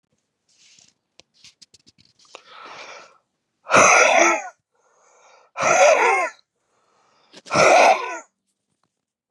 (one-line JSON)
{"exhalation_length": "9.3 s", "exhalation_amplitude": 28742, "exhalation_signal_mean_std_ratio": 0.39, "survey_phase": "beta (2021-08-13 to 2022-03-07)", "age": "45-64", "gender": "Male", "wearing_mask": "No", "symptom_cough_any": true, "symptom_runny_or_blocked_nose": true, "symptom_sore_throat": true, "symptom_fatigue": true, "symptom_fever_high_temperature": true, "symptom_headache": true, "symptom_onset": "4 days", "smoker_status": "Ex-smoker", "respiratory_condition_asthma": false, "respiratory_condition_other": false, "recruitment_source": "Test and Trace", "submission_delay": "2 days", "covid_test_result": "Positive", "covid_test_method": "RT-qPCR", "covid_ct_value": 17.6, "covid_ct_gene": "ORF1ab gene", "covid_ct_mean": 17.8, "covid_viral_load": "1500000 copies/ml", "covid_viral_load_category": "High viral load (>1M copies/ml)"}